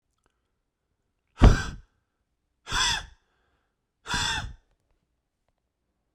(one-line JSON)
{"exhalation_length": "6.1 s", "exhalation_amplitude": 21818, "exhalation_signal_mean_std_ratio": 0.24, "survey_phase": "beta (2021-08-13 to 2022-03-07)", "age": "18-44", "gender": "Male", "wearing_mask": "No", "symptom_cough_any": true, "symptom_runny_or_blocked_nose": true, "symptom_fatigue": true, "smoker_status": "Never smoked", "recruitment_source": "Test and Trace", "submission_delay": "1 day", "covid_test_result": "Positive", "covid_test_method": "RT-qPCR", "covid_ct_value": 19.6, "covid_ct_gene": "ORF1ab gene", "covid_ct_mean": 20.1, "covid_viral_load": "260000 copies/ml", "covid_viral_load_category": "Low viral load (10K-1M copies/ml)"}